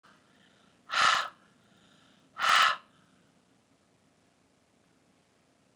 {"exhalation_length": "5.8 s", "exhalation_amplitude": 10068, "exhalation_signal_mean_std_ratio": 0.28, "survey_phase": "beta (2021-08-13 to 2022-03-07)", "age": "45-64", "gender": "Female", "wearing_mask": "No", "symptom_cough_any": true, "symptom_shortness_of_breath": true, "smoker_status": "Ex-smoker", "respiratory_condition_asthma": false, "respiratory_condition_other": true, "recruitment_source": "REACT", "submission_delay": "1 day", "covid_test_result": "Negative", "covid_test_method": "RT-qPCR", "influenza_a_test_result": "Negative", "influenza_b_test_result": "Negative"}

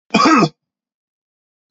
{"cough_length": "1.7 s", "cough_amplitude": 32767, "cough_signal_mean_std_ratio": 0.38, "survey_phase": "beta (2021-08-13 to 2022-03-07)", "age": "45-64", "gender": "Male", "wearing_mask": "No", "symptom_none": true, "smoker_status": "Ex-smoker", "respiratory_condition_asthma": false, "respiratory_condition_other": false, "recruitment_source": "REACT", "submission_delay": "1 day", "covid_test_result": "Negative", "covid_test_method": "RT-qPCR", "influenza_a_test_result": "Negative", "influenza_b_test_result": "Negative"}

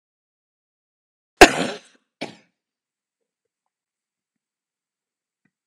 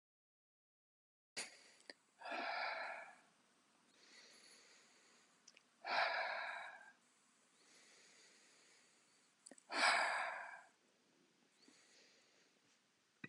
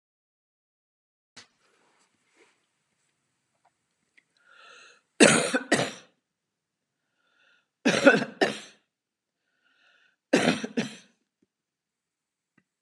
{"cough_length": "5.7 s", "cough_amplitude": 32768, "cough_signal_mean_std_ratio": 0.12, "exhalation_length": "13.3 s", "exhalation_amplitude": 2867, "exhalation_signal_mean_std_ratio": 0.36, "three_cough_length": "12.8 s", "three_cough_amplitude": 27600, "three_cough_signal_mean_std_ratio": 0.24, "survey_phase": "beta (2021-08-13 to 2022-03-07)", "age": "65+", "gender": "Female", "wearing_mask": "No", "symptom_none": true, "smoker_status": "Never smoked", "respiratory_condition_asthma": false, "respiratory_condition_other": false, "recruitment_source": "REACT", "submission_delay": "1 day", "covid_test_result": "Negative", "covid_test_method": "RT-qPCR"}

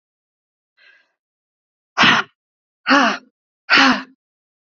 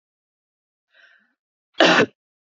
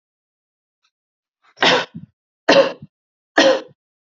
{"exhalation_length": "4.7 s", "exhalation_amplitude": 31189, "exhalation_signal_mean_std_ratio": 0.33, "cough_length": "2.5 s", "cough_amplitude": 28087, "cough_signal_mean_std_ratio": 0.26, "three_cough_length": "4.2 s", "three_cough_amplitude": 28812, "three_cough_signal_mean_std_ratio": 0.32, "survey_phase": "beta (2021-08-13 to 2022-03-07)", "age": "18-44", "gender": "Female", "wearing_mask": "No", "symptom_runny_or_blocked_nose": true, "symptom_sore_throat": true, "symptom_onset": "2 days", "smoker_status": "Never smoked", "respiratory_condition_asthma": false, "respiratory_condition_other": false, "recruitment_source": "Test and Trace", "submission_delay": "1 day", "covid_test_result": "Positive", "covid_test_method": "RT-qPCR", "covid_ct_value": 24.5, "covid_ct_gene": "N gene"}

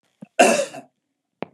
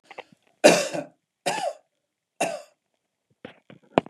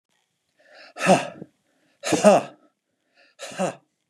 {"cough_length": "1.5 s", "cough_amplitude": 31540, "cough_signal_mean_std_ratio": 0.34, "three_cough_length": "4.1 s", "three_cough_amplitude": 31990, "three_cough_signal_mean_std_ratio": 0.28, "exhalation_length": "4.1 s", "exhalation_amplitude": 27325, "exhalation_signal_mean_std_ratio": 0.31, "survey_phase": "beta (2021-08-13 to 2022-03-07)", "age": "45-64", "gender": "Male", "wearing_mask": "No", "symptom_none": true, "smoker_status": "Never smoked", "respiratory_condition_asthma": false, "respiratory_condition_other": false, "recruitment_source": "REACT", "submission_delay": "2 days", "covid_test_result": "Negative", "covid_test_method": "RT-qPCR"}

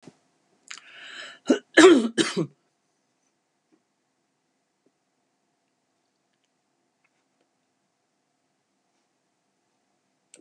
{"cough_length": "10.4 s", "cough_amplitude": 27110, "cough_signal_mean_std_ratio": 0.18, "survey_phase": "beta (2021-08-13 to 2022-03-07)", "age": "65+", "gender": "Female", "wearing_mask": "No", "symptom_cough_any": true, "smoker_status": "Never smoked", "respiratory_condition_asthma": false, "respiratory_condition_other": false, "recruitment_source": "REACT", "submission_delay": "2 days", "covid_test_result": "Negative", "covid_test_method": "RT-qPCR", "influenza_a_test_result": "Negative", "influenza_b_test_result": "Negative"}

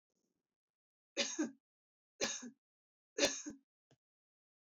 {"three_cough_length": "4.6 s", "three_cough_amplitude": 4514, "three_cough_signal_mean_std_ratio": 0.3, "survey_phase": "beta (2021-08-13 to 2022-03-07)", "age": "45-64", "gender": "Female", "wearing_mask": "No", "symptom_none": true, "smoker_status": "Never smoked", "respiratory_condition_asthma": false, "respiratory_condition_other": false, "recruitment_source": "REACT", "submission_delay": "2 days", "covid_test_method": "RT-qPCR", "influenza_a_test_result": "Unknown/Void", "influenza_b_test_result": "Unknown/Void"}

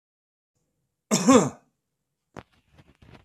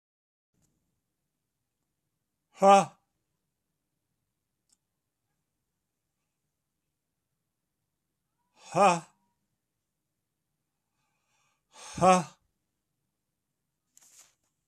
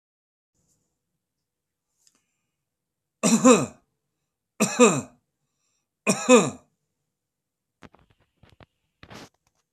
{"cough_length": "3.2 s", "cough_amplitude": 20845, "cough_signal_mean_std_ratio": 0.25, "exhalation_length": "14.7 s", "exhalation_amplitude": 14908, "exhalation_signal_mean_std_ratio": 0.17, "three_cough_length": "9.7 s", "three_cough_amplitude": 23708, "three_cough_signal_mean_std_ratio": 0.24, "survey_phase": "beta (2021-08-13 to 2022-03-07)", "age": "65+", "gender": "Male", "wearing_mask": "No", "symptom_runny_or_blocked_nose": true, "symptom_headache": true, "symptom_onset": "12 days", "smoker_status": "Never smoked", "respiratory_condition_asthma": false, "respiratory_condition_other": false, "recruitment_source": "REACT", "submission_delay": "1 day", "covid_test_result": "Negative", "covid_test_method": "RT-qPCR", "influenza_a_test_result": "Unknown/Void", "influenza_b_test_result": "Unknown/Void"}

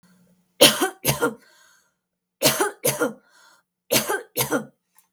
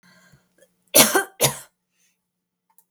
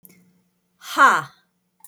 {"three_cough_length": "5.1 s", "three_cough_amplitude": 32768, "three_cough_signal_mean_std_ratio": 0.39, "cough_length": "2.9 s", "cough_amplitude": 32768, "cough_signal_mean_std_ratio": 0.27, "exhalation_length": "1.9 s", "exhalation_amplitude": 24582, "exhalation_signal_mean_std_ratio": 0.3, "survey_phase": "beta (2021-08-13 to 2022-03-07)", "age": "45-64", "gender": "Female", "wearing_mask": "No", "symptom_fatigue": true, "symptom_onset": "8 days", "smoker_status": "Never smoked", "respiratory_condition_asthma": false, "respiratory_condition_other": false, "recruitment_source": "REACT", "submission_delay": "2 days", "covid_test_result": "Negative", "covid_test_method": "RT-qPCR"}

